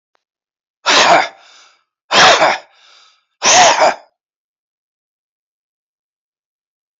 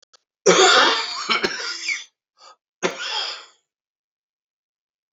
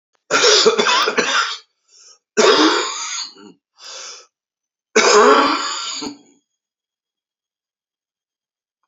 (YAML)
exhalation_length: 7.0 s
exhalation_amplitude: 32534
exhalation_signal_mean_std_ratio: 0.37
cough_length: 5.1 s
cough_amplitude: 29451
cough_signal_mean_std_ratio: 0.42
three_cough_length: 8.9 s
three_cough_amplitude: 32045
three_cough_signal_mean_std_ratio: 0.47
survey_phase: beta (2021-08-13 to 2022-03-07)
age: 45-64
gender: Male
wearing_mask: 'No'
symptom_cough_any: true
symptom_runny_or_blocked_nose: true
symptom_shortness_of_breath: true
symptom_sore_throat: true
symptom_abdominal_pain: true
symptom_fatigue: true
symptom_fever_high_temperature: true
symptom_headache: true
symptom_change_to_sense_of_smell_or_taste: true
symptom_onset: 3 days
smoker_status: Ex-smoker
respiratory_condition_asthma: false
respiratory_condition_other: false
recruitment_source: Test and Trace
submission_delay: 1 day
covid_test_result: Positive
covid_test_method: RT-qPCR
covid_ct_value: 21.6
covid_ct_gene: ORF1ab gene
covid_ct_mean: 21.9
covid_viral_load: 64000 copies/ml
covid_viral_load_category: Low viral load (10K-1M copies/ml)